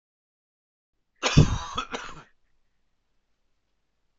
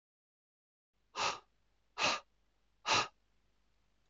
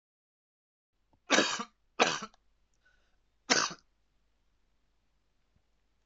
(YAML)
cough_length: 4.2 s
cough_amplitude: 20859
cough_signal_mean_std_ratio: 0.24
exhalation_length: 4.1 s
exhalation_amplitude: 4209
exhalation_signal_mean_std_ratio: 0.31
three_cough_length: 6.1 s
three_cough_amplitude: 12894
three_cough_signal_mean_std_ratio: 0.25
survey_phase: alpha (2021-03-01 to 2021-08-12)
age: 18-44
gender: Male
wearing_mask: 'No'
symptom_cough_any: true
symptom_new_continuous_cough: true
symptom_diarrhoea: true
symptom_fatigue: true
symptom_fever_high_temperature: true
symptom_headache: true
symptom_change_to_sense_of_smell_or_taste: true
symptom_onset: 4 days
smoker_status: Never smoked
respiratory_condition_asthma: false
respiratory_condition_other: false
recruitment_source: Test and Trace
submission_delay: 1 day
covid_test_result: Positive
covid_test_method: RT-qPCR
covid_ct_value: 31.8
covid_ct_gene: N gene